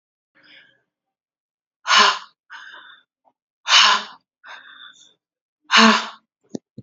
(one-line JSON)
{"exhalation_length": "6.8 s", "exhalation_amplitude": 31473, "exhalation_signal_mean_std_ratio": 0.31, "survey_phase": "beta (2021-08-13 to 2022-03-07)", "age": "18-44", "gender": "Female", "wearing_mask": "No", "symptom_none": true, "smoker_status": "Never smoked", "respiratory_condition_asthma": false, "respiratory_condition_other": false, "recruitment_source": "REACT", "submission_delay": "0 days", "covid_test_result": "Negative", "covid_test_method": "RT-qPCR"}